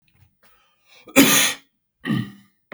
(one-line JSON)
{"cough_length": "2.7 s", "cough_amplitude": 32768, "cough_signal_mean_std_ratio": 0.35, "survey_phase": "beta (2021-08-13 to 2022-03-07)", "age": "45-64", "gender": "Male", "wearing_mask": "No", "symptom_none": true, "smoker_status": "Never smoked", "respiratory_condition_asthma": false, "respiratory_condition_other": false, "recruitment_source": "REACT", "submission_delay": "1 day", "covid_test_result": "Negative", "covid_test_method": "RT-qPCR", "influenza_a_test_result": "Negative", "influenza_b_test_result": "Negative"}